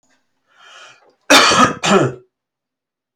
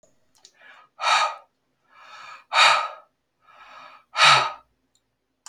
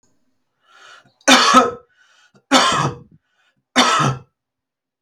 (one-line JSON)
{"cough_length": "3.2 s", "cough_amplitude": 32767, "cough_signal_mean_std_ratio": 0.39, "exhalation_length": "5.5 s", "exhalation_amplitude": 27723, "exhalation_signal_mean_std_ratio": 0.35, "three_cough_length": "5.0 s", "three_cough_amplitude": 32333, "three_cough_signal_mean_std_ratio": 0.4, "survey_phase": "alpha (2021-03-01 to 2021-08-12)", "age": "45-64", "gender": "Male", "wearing_mask": "No", "symptom_none": true, "smoker_status": "Ex-smoker", "respiratory_condition_asthma": false, "respiratory_condition_other": false, "recruitment_source": "REACT", "submission_delay": "1 day", "covid_test_result": "Negative", "covid_test_method": "RT-qPCR"}